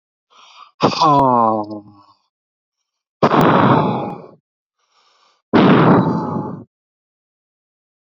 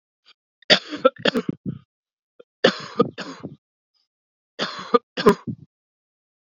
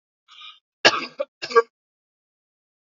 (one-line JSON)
{"exhalation_length": "8.1 s", "exhalation_amplitude": 32768, "exhalation_signal_mean_std_ratio": 0.47, "three_cough_length": "6.5 s", "three_cough_amplitude": 32767, "three_cough_signal_mean_std_ratio": 0.28, "cough_length": "2.8 s", "cough_amplitude": 30170, "cough_signal_mean_std_ratio": 0.23, "survey_phase": "beta (2021-08-13 to 2022-03-07)", "age": "45-64", "gender": "Male", "wearing_mask": "No", "symptom_cough_any": true, "symptom_sore_throat": true, "symptom_diarrhoea": true, "symptom_fatigue": true, "symptom_other": true, "smoker_status": "Current smoker (e-cigarettes or vapes only)", "respiratory_condition_asthma": true, "respiratory_condition_other": false, "recruitment_source": "Test and Trace", "submission_delay": "1 day", "covid_test_result": "Positive", "covid_test_method": "RT-qPCR", "covid_ct_value": 27.1, "covid_ct_gene": "N gene"}